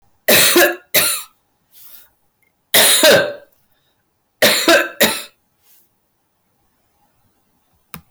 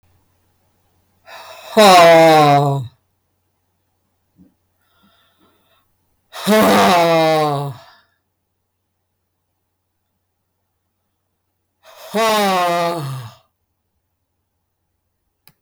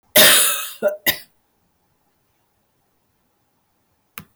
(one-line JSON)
{"three_cough_length": "8.1 s", "three_cough_amplitude": 25723, "three_cough_signal_mean_std_ratio": 0.43, "exhalation_length": "15.6 s", "exhalation_amplitude": 30498, "exhalation_signal_mean_std_ratio": 0.41, "cough_length": "4.4 s", "cough_amplitude": 23897, "cough_signal_mean_std_ratio": 0.32, "survey_phase": "beta (2021-08-13 to 2022-03-07)", "age": "65+", "gender": "Female", "wearing_mask": "No", "symptom_none": true, "smoker_status": "Never smoked", "respiratory_condition_asthma": false, "respiratory_condition_other": false, "recruitment_source": "REACT", "submission_delay": "5 days", "covid_test_result": "Negative", "covid_test_method": "RT-qPCR", "influenza_a_test_result": "Negative", "influenza_b_test_result": "Negative"}